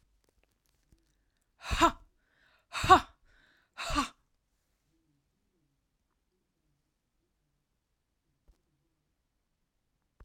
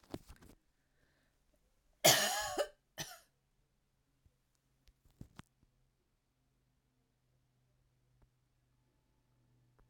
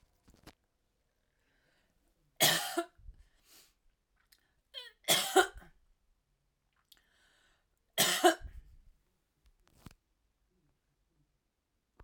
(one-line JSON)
{"exhalation_length": "10.2 s", "exhalation_amplitude": 14650, "exhalation_signal_mean_std_ratio": 0.17, "cough_length": "9.9 s", "cough_amplitude": 8528, "cough_signal_mean_std_ratio": 0.19, "three_cough_length": "12.0 s", "three_cough_amplitude": 9315, "three_cough_signal_mean_std_ratio": 0.23, "survey_phase": "alpha (2021-03-01 to 2021-08-12)", "age": "65+", "gender": "Female", "wearing_mask": "No", "symptom_headache": true, "smoker_status": "Ex-smoker", "respiratory_condition_asthma": false, "respiratory_condition_other": false, "recruitment_source": "REACT", "submission_delay": "3 days", "covid_test_result": "Negative", "covid_test_method": "RT-qPCR"}